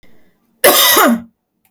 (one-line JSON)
{"cough_length": "1.7 s", "cough_amplitude": 32768, "cough_signal_mean_std_ratio": 0.52, "survey_phase": "beta (2021-08-13 to 2022-03-07)", "age": "18-44", "gender": "Female", "wearing_mask": "No", "symptom_none": true, "smoker_status": "Never smoked", "respiratory_condition_asthma": false, "respiratory_condition_other": false, "recruitment_source": "REACT", "submission_delay": "1 day", "covid_test_result": "Negative", "covid_test_method": "RT-qPCR"}